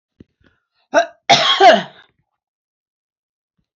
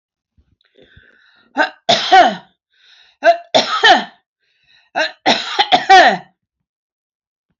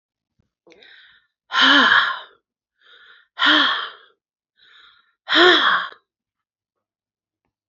{"cough_length": "3.8 s", "cough_amplitude": 30991, "cough_signal_mean_std_ratio": 0.32, "three_cough_length": "7.6 s", "three_cough_amplitude": 30087, "three_cough_signal_mean_std_ratio": 0.39, "exhalation_length": "7.7 s", "exhalation_amplitude": 29424, "exhalation_signal_mean_std_ratio": 0.38, "survey_phase": "alpha (2021-03-01 to 2021-08-12)", "age": "65+", "gender": "Female", "wearing_mask": "No", "symptom_none": true, "smoker_status": "Never smoked", "respiratory_condition_asthma": false, "respiratory_condition_other": false, "recruitment_source": "REACT", "submission_delay": "3 days", "covid_test_result": "Negative", "covid_test_method": "RT-qPCR"}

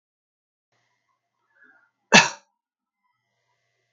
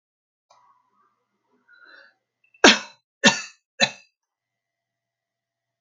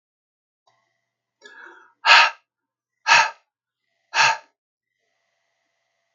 {"cough_length": "3.9 s", "cough_amplitude": 32767, "cough_signal_mean_std_ratio": 0.14, "three_cough_length": "5.8 s", "three_cough_amplitude": 32767, "three_cough_signal_mean_std_ratio": 0.18, "exhalation_length": "6.1 s", "exhalation_amplitude": 32767, "exhalation_signal_mean_std_ratio": 0.26, "survey_phase": "beta (2021-08-13 to 2022-03-07)", "age": "65+", "gender": "Female", "wearing_mask": "No", "symptom_none": true, "smoker_status": "Ex-smoker", "respiratory_condition_asthma": false, "respiratory_condition_other": false, "recruitment_source": "REACT", "submission_delay": "2 days", "covid_test_result": "Negative", "covid_test_method": "RT-qPCR", "influenza_a_test_result": "Negative", "influenza_b_test_result": "Negative"}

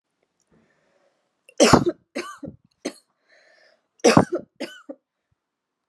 {"three_cough_length": "5.9 s", "three_cough_amplitude": 32742, "three_cough_signal_mean_std_ratio": 0.25, "survey_phase": "alpha (2021-03-01 to 2021-08-12)", "age": "18-44", "gender": "Female", "wearing_mask": "No", "symptom_shortness_of_breath": true, "smoker_status": "Never smoked", "respiratory_condition_asthma": false, "respiratory_condition_other": false, "recruitment_source": "REACT", "submission_delay": "1 day", "covid_test_result": "Negative", "covid_test_method": "RT-qPCR"}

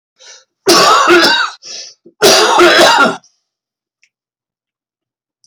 {"cough_length": "5.5 s", "cough_amplitude": 32768, "cough_signal_mean_std_ratio": 0.54, "survey_phase": "alpha (2021-03-01 to 2021-08-12)", "age": "65+", "gender": "Male", "wearing_mask": "No", "symptom_cough_any": true, "symptom_onset": "12 days", "smoker_status": "Never smoked", "respiratory_condition_asthma": false, "respiratory_condition_other": false, "recruitment_source": "REACT", "submission_delay": "1 day", "covid_test_result": "Negative", "covid_test_method": "RT-qPCR"}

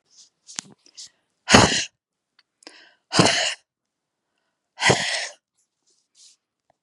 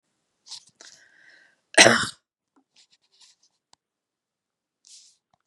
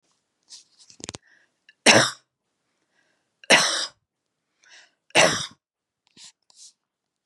{"exhalation_length": "6.8 s", "exhalation_amplitude": 32768, "exhalation_signal_mean_std_ratio": 0.3, "cough_length": "5.5 s", "cough_amplitude": 32768, "cough_signal_mean_std_ratio": 0.17, "three_cough_length": "7.3 s", "three_cough_amplitude": 31564, "three_cough_signal_mean_std_ratio": 0.26, "survey_phase": "beta (2021-08-13 to 2022-03-07)", "age": "45-64", "gender": "Female", "wearing_mask": "No", "symptom_none": true, "smoker_status": "Never smoked", "respiratory_condition_asthma": false, "respiratory_condition_other": false, "recruitment_source": "REACT", "submission_delay": "1 day", "covid_test_result": "Negative", "covid_test_method": "RT-qPCR", "influenza_a_test_result": "Negative", "influenza_b_test_result": "Negative"}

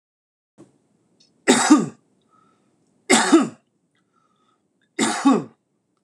{"three_cough_length": "6.0 s", "three_cough_amplitude": 26028, "three_cough_signal_mean_std_ratio": 0.33, "survey_phase": "beta (2021-08-13 to 2022-03-07)", "age": "45-64", "gender": "Male", "wearing_mask": "No", "symptom_sore_throat": true, "symptom_onset": "2 days", "smoker_status": "Ex-smoker", "respiratory_condition_asthma": false, "respiratory_condition_other": false, "recruitment_source": "REACT", "submission_delay": "1 day", "covid_test_result": "Negative", "covid_test_method": "RT-qPCR"}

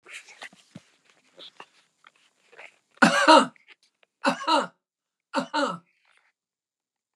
{"three_cough_length": "7.2 s", "three_cough_amplitude": 29812, "three_cough_signal_mean_std_ratio": 0.28, "survey_phase": "beta (2021-08-13 to 2022-03-07)", "age": "65+", "gender": "Female", "wearing_mask": "No", "symptom_change_to_sense_of_smell_or_taste": true, "smoker_status": "Never smoked", "respiratory_condition_asthma": true, "respiratory_condition_other": false, "recruitment_source": "REACT", "submission_delay": "1 day", "covid_test_result": "Negative", "covid_test_method": "RT-qPCR", "influenza_a_test_result": "Negative", "influenza_b_test_result": "Negative"}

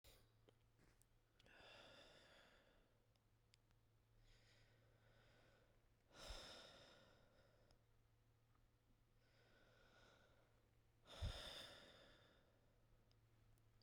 {"exhalation_length": "13.8 s", "exhalation_amplitude": 385, "exhalation_signal_mean_std_ratio": 0.47, "survey_phase": "beta (2021-08-13 to 2022-03-07)", "age": "18-44", "gender": "Female", "wearing_mask": "No", "symptom_cough_any": true, "symptom_runny_or_blocked_nose": true, "symptom_abdominal_pain": true, "symptom_fever_high_temperature": true, "symptom_headache": true, "symptom_other": true, "smoker_status": "Never smoked", "respiratory_condition_asthma": false, "respiratory_condition_other": false, "recruitment_source": "Test and Trace", "submission_delay": "1 day", "covid_test_result": "Positive", "covid_test_method": "LFT"}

